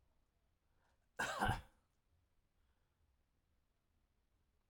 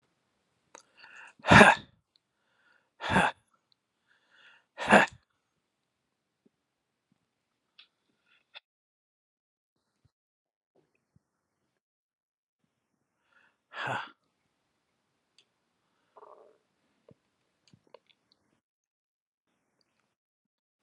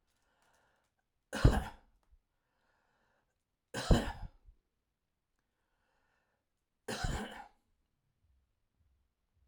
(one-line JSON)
{"cough_length": "4.7 s", "cough_amplitude": 2105, "cough_signal_mean_std_ratio": 0.24, "exhalation_length": "20.8 s", "exhalation_amplitude": 28338, "exhalation_signal_mean_std_ratio": 0.14, "three_cough_length": "9.5 s", "three_cough_amplitude": 8423, "three_cough_signal_mean_std_ratio": 0.22, "survey_phase": "alpha (2021-03-01 to 2021-08-12)", "age": "65+", "gender": "Male", "wearing_mask": "No", "symptom_none": true, "smoker_status": "Never smoked", "respiratory_condition_asthma": false, "respiratory_condition_other": false, "recruitment_source": "REACT", "submission_delay": "1 day", "covid_test_result": "Negative", "covid_test_method": "RT-qPCR"}